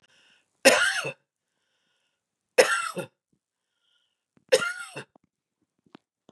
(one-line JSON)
{"three_cough_length": "6.3 s", "three_cough_amplitude": 27803, "three_cough_signal_mean_std_ratio": 0.27, "survey_phase": "beta (2021-08-13 to 2022-03-07)", "age": "45-64", "gender": "Female", "wearing_mask": "No", "symptom_cough_any": true, "symptom_new_continuous_cough": true, "symptom_runny_or_blocked_nose": true, "symptom_sore_throat": true, "symptom_fatigue": true, "symptom_headache": true, "symptom_onset": "2 days", "smoker_status": "Never smoked", "respiratory_condition_asthma": false, "respiratory_condition_other": false, "recruitment_source": "Test and Trace", "submission_delay": "1 day", "covid_test_result": "Negative", "covid_test_method": "RT-qPCR"}